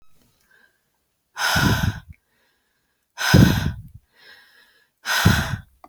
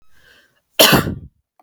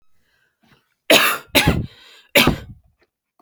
{
  "exhalation_length": "5.9 s",
  "exhalation_amplitude": 27185,
  "exhalation_signal_mean_std_ratio": 0.39,
  "cough_length": "1.6 s",
  "cough_amplitude": 32768,
  "cough_signal_mean_std_ratio": 0.35,
  "three_cough_length": "3.4 s",
  "three_cough_amplitude": 32768,
  "three_cough_signal_mean_std_ratio": 0.37,
  "survey_phase": "beta (2021-08-13 to 2022-03-07)",
  "age": "18-44",
  "gender": "Female",
  "wearing_mask": "No",
  "symptom_none": true,
  "smoker_status": "Never smoked",
  "respiratory_condition_asthma": false,
  "respiratory_condition_other": false,
  "recruitment_source": "Test and Trace",
  "submission_delay": "0 days",
  "covid_test_result": "Negative",
  "covid_test_method": "LFT"
}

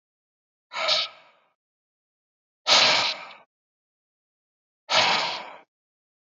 {
  "exhalation_length": "6.4 s",
  "exhalation_amplitude": 18349,
  "exhalation_signal_mean_std_ratio": 0.36,
  "survey_phase": "beta (2021-08-13 to 2022-03-07)",
  "age": "45-64",
  "gender": "Male",
  "wearing_mask": "No",
  "symptom_runny_or_blocked_nose": true,
  "symptom_other": true,
  "smoker_status": "Never smoked",
  "respiratory_condition_asthma": false,
  "respiratory_condition_other": false,
  "recruitment_source": "Test and Trace",
  "submission_delay": "1 day",
  "covid_test_result": "Negative",
  "covid_test_method": "RT-qPCR"
}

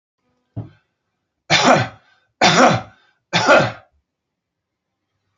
{
  "three_cough_length": "5.4 s",
  "three_cough_amplitude": 30539,
  "three_cough_signal_mean_std_ratio": 0.37,
  "survey_phase": "alpha (2021-03-01 to 2021-08-12)",
  "age": "45-64",
  "gender": "Male",
  "wearing_mask": "No",
  "symptom_none": true,
  "smoker_status": "Ex-smoker",
  "respiratory_condition_asthma": false,
  "respiratory_condition_other": false,
  "recruitment_source": "REACT",
  "submission_delay": "1 day",
  "covid_test_result": "Negative",
  "covid_test_method": "RT-qPCR"
}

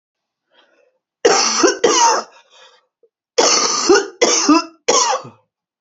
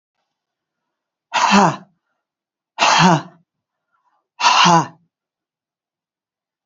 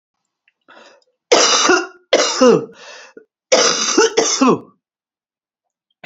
{
  "cough_length": "5.8 s",
  "cough_amplitude": 31794,
  "cough_signal_mean_std_ratio": 0.54,
  "exhalation_length": "6.7 s",
  "exhalation_amplitude": 29589,
  "exhalation_signal_mean_std_ratio": 0.35,
  "three_cough_length": "6.1 s",
  "three_cough_amplitude": 32768,
  "three_cough_signal_mean_std_ratio": 0.48,
  "survey_phase": "beta (2021-08-13 to 2022-03-07)",
  "age": "45-64",
  "gender": "Female",
  "wearing_mask": "No",
  "symptom_none": true,
  "smoker_status": "Ex-smoker",
  "respiratory_condition_asthma": true,
  "respiratory_condition_other": false,
  "recruitment_source": "REACT",
  "submission_delay": "1 day",
  "covid_test_result": "Negative",
  "covid_test_method": "RT-qPCR",
  "influenza_a_test_result": "Negative",
  "influenza_b_test_result": "Negative"
}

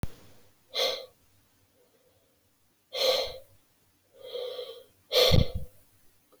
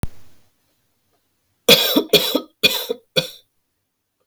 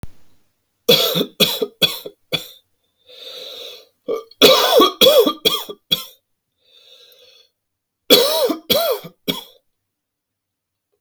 {
  "exhalation_length": "6.4 s",
  "exhalation_amplitude": 13396,
  "exhalation_signal_mean_std_ratio": 0.37,
  "cough_length": "4.3 s",
  "cough_amplitude": 32768,
  "cough_signal_mean_std_ratio": 0.35,
  "three_cough_length": "11.0 s",
  "three_cough_amplitude": 32767,
  "three_cough_signal_mean_std_ratio": 0.4,
  "survey_phase": "alpha (2021-03-01 to 2021-08-12)",
  "age": "45-64",
  "gender": "Male",
  "wearing_mask": "No",
  "symptom_none": true,
  "smoker_status": "Ex-smoker",
  "respiratory_condition_asthma": true,
  "respiratory_condition_other": false,
  "recruitment_source": "REACT",
  "submission_delay": "3 days",
  "covid_test_result": "Negative",
  "covid_test_method": "RT-qPCR"
}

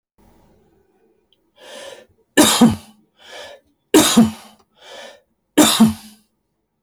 {
  "three_cough_length": "6.8 s",
  "three_cough_amplitude": 29805,
  "three_cough_signal_mean_std_ratio": 0.34,
  "survey_phase": "beta (2021-08-13 to 2022-03-07)",
  "age": "65+",
  "gender": "Male",
  "wearing_mask": "No",
  "symptom_none": true,
  "smoker_status": "Never smoked",
  "respiratory_condition_asthma": false,
  "respiratory_condition_other": false,
  "recruitment_source": "REACT",
  "submission_delay": "1 day",
  "covid_test_result": "Negative",
  "covid_test_method": "RT-qPCR"
}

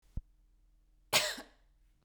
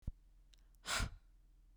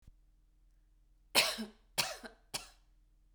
{
  "cough_length": "2.0 s",
  "cough_amplitude": 6976,
  "cough_signal_mean_std_ratio": 0.29,
  "exhalation_length": "1.8 s",
  "exhalation_amplitude": 1765,
  "exhalation_signal_mean_std_ratio": 0.42,
  "three_cough_length": "3.3 s",
  "three_cough_amplitude": 7282,
  "three_cough_signal_mean_std_ratio": 0.3,
  "survey_phase": "beta (2021-08-13 to 2022-03-07)",
  "age": "18-44",
  "gender": "Female",
  "wearing_mask": "Yes",
  "symptom_runny_or_blocked_nose": true,
  "smoker_status": "Never smoked",
  "respiratory_condition_asthma": true,
  "respiratory_condition_other": false,
  "recruitment_source": "Test and Trace",
  "submission_delay": "-1 day",
  "covid_test_result": "Negative",
  "covid_test_method": "LFT"
}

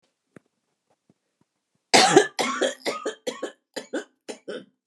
{
  "cough_length": "4.9 s",
  "cough_amplitude": 28969,
  "cough_signal_mean_std_ratio": 0.33,
  "survey_phase": "beta (2021-08-13 to 2022-03-07)",
  "age": "65+",
  "gender": "Female",
  "wearing_mask": "No",
  "symptom_none": true,
  "smoker_status": "Prefer not to say",
  "respiratory_condition_asthma": false,
  "respiratory_condition_other": false,
  "recruitment_source": "REACT",
  "submission_delay": "3 days",
  "covid_test_result": "Negative",
  "covid_test_method": "RT-qPCR",
  "influenza_a_test_result": "Negative",
  "influenza_b_test_result": "Negative"
}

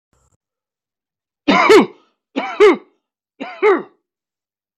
{
  "three_cough_length": "4.8 s",
  "three_cough_amplitude": 28886,
  "three_cough_signal_mean_std_ratio": 0.35,
  "survey_phase": "alpha (2021-03-01 to 2021-08-12)",
  "age": "45-64",
  "gender": "Male",
  "wearing_mask": "No",
  "symptom_shortness_of_breath": true,
  "symptom_fatigue": true,
  "symptom_headache": true,
  "smoker_status": "Never smoked",
  "respiratory_condition_asthma": true,
  "respiratory_condition_other": false,
  "recruitment_source": "REACT",
  "submission_delay": "2 days",
  "covid_test_result": "Negative",
  "covid_test_method": "RT-qPCR"
}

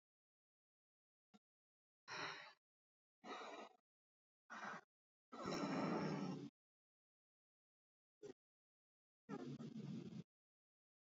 {
  "exhalation_length": "11.0 s",
  "exhalation_amplitude": 787,
  "exhalation_signal_mean_std_ratio": 0.42,
  "survey_phase": "beta (2021-08-13 to 2022-03-07)",
  "age": "18-44",
  "gender": "Female",
  "wearing_mask": "No",
  "symptom_new_continuous_cough": true,
  "symptom_runny_or_blocked_nose": true,
  "symptom_shortness_of_breath": true,
  "symptom_sore_throat": true,
  "symptom_fatigue": true,
  "symptom_onset": "8 days",
  "smoker_status": "Current smoker (1 to 10 cigarettes per day)",
  "respiratory_condition_asthma": true,
  "respiratory_condition_other": false,
  "recruitment_source": "REACT",
  "submission_delay": "2 days",
  "covid_test_result": "Negative",
  "covid_test_method": "RT-qPCR",
  "influenza_a_test_result": "Negative",
  "influenza_b_test_result": "Negative"
}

